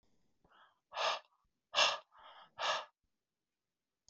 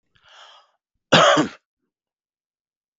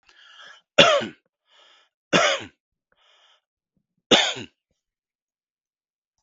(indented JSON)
{
  "exhalation_length": "4.1 s",
  "exhalation_amplitude": 4972,
  "exhalation_signal_mean_std_ratio": 0.32,
  "cough_length": "3.0 s",
  "cough_amplitude": 32768,
  "cough_signal_mean_std_ratio": 0.28,
  "three_cough_length": "6.2 s",
  "three_cough_amplitude": 32768,
  "three_cough_signal_mean_std_ratio": 0.27,
  "survey_phase": "beta (2021-08-13 to 2022-03-07)",
  "age": "18-44",
  "gender": "Male",
  "wearing_mask": "No",
  "symptom_none": true,
  "smoker_status": "Ex-smoker",
  "respiratory_condition_asthma": false,
  "respiratory_condition_other": false,
  "recruitment_source": "REACT",
  "submission_delay": "4 days",
  "covid_test_result": "Negative",
  "covid_test_method": "RT-qPCR",
  "influenza_a_test_result": "Negative",
  "influenza_b_test_result": "Negative"
}